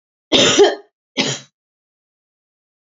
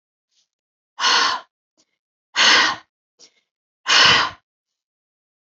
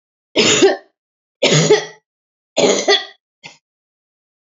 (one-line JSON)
{"cough_length": "3.0 s", "cough_amplitude": 30856, "cough_signal_mean_std_ratio": 0.35, "exhalation_length": "5.5 s", "exhalation_amplitude": 28920, "exhalation_signal_mean_std_ratio": 0.37, "three_cough_length": "4.4 s", "three_cough_amplitude": 31013, "three_cough_signal_mean_std_ratio": 0.44, "survey_phase": "alpha (2021-03-01 to 2021-08-12)", "age": "45-64", "gender": "Female", "wearing_mask": "No", "symptom_none": true, "smoker_status": "Never smoked", "respiratory_condition_asthma": false, "respiratory_condition_other": false, "recruitment_source": "Test and Trace", "submission_delay": "0 days", "covid_test_result": "Negative", "covid_test_method": "LFT"}